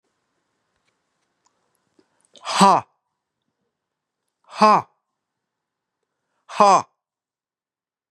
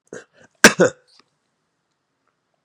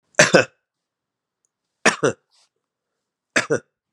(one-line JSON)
{"exhalation_length": "8.1 s", "exhalation_amplitude": 31684, "exhalation_signal_mean_std_ratio": 0.22, "cough_length": "2.6 s", "cough_amplitude": 32768, "cough_signal_mean_std_ratio": 0.19, "three_cough_length": "3.9 s", "three_cough_amplitude": 32767, "three_cough_signal_mean_std_ratio": 0.26, "survey_phase": "beta (2021-08-13 to 2022-03-07)", "age": "45-64", "gender": "Male", "wearing_mask": "No", "symptom_cough_any": true, "symptom_runny_or_blocked_nose": true, "smoker_status": "Never smoked", "respiratory_condition_asthma": false, "respiratory_condition_other": false, "recruitment_source": "Test and Trace", "submission_delay": "2 days", "covid_test_result": "Positive", "covid_test_method": "RT-qPCR", "covid_ct_value": 22.1, "covid_ct_gene": "ORF1ab gene", "covid_ct_mean": 22.5, "covid_viral_load": "43000 copies/ml", "covid_viral_load_category": "Low viral load (10K-1M copies/ml)"}